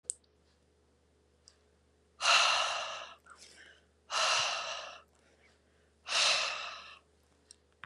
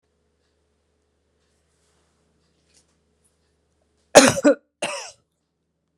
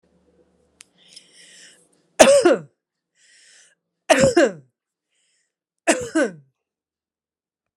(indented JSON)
{
  "exhalation_length": "7.9 s",
  "exhalation_amplitude": 7655,
  "exhalation_signal_mean_std_ratio": 0.42,
  "cough_length": "6.0 s",
  "cough_amplitude": 32768,
  "cough_signal_mean_std_ratio": 0.18,
  "three_cough_length": "7.8 s",
  "three_cough_amplitude": 32768,
  "three_cough_signal_mean_std_ratio": 0.29,
  "survey_phase": "beta (2021-08-13 to 2022-03-07)",
  "age": "45-64",
  "gender": "Female",
  "wearing_mask": "No",
  "symptom_none": true,
  "smoker_status": "Ex-smoker",
  "respiratory_condition_asthma": false,
  "respiratory_condition_other": false,
  "recruitment_source": "REACT",
  "submission_delay": "3 days",
  "covid_test_result": "Negative",
  "covid_test_method": "RT-qPCR"
}